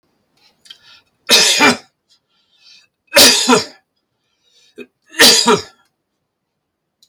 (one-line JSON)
{"three_cough_length": "7.1 s", "three_cough_amplitude": 32768, "three_cough_signal_mean_std_ratio": 0.36, "survey_phase": "beta (2021-08-13 to 2022-03-07)", "age": "65+", "gender": "Male", "wearing_mask": "No", "symptom_none": true, "smoker_status": "Never smoked", "respiratory_condition_asthma": false, "respiratory_condition_other": false, "recruitment_source": "REACT", "submission_delay": "3 days", "covid_test_result": "Negative", "covid_test_method": "RT-qPCR"}